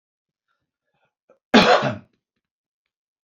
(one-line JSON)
{"cough_length": "3.2 s", "cough_amplitude": 29384, "cough_signal_mean_std_ratio": 0.26, "survey_phase": "beta (2021-08-13 to 2022-03-07)", "age": "65+", "gender": "Male", "wearing_mask": "No", "symptom_none": true, "smoker_status": "Ex-smoker", "respiratory_condition_asthma": false, "respiratory_condition_other": false, "recruitment_source": "REACT", "submission_delay": "1 day", "covid_test_result": "Negative", "covid_test_method": "RT-qPCR", "influenza_a_test_result": "Negative", "influenza_b_test_result": "Negative"}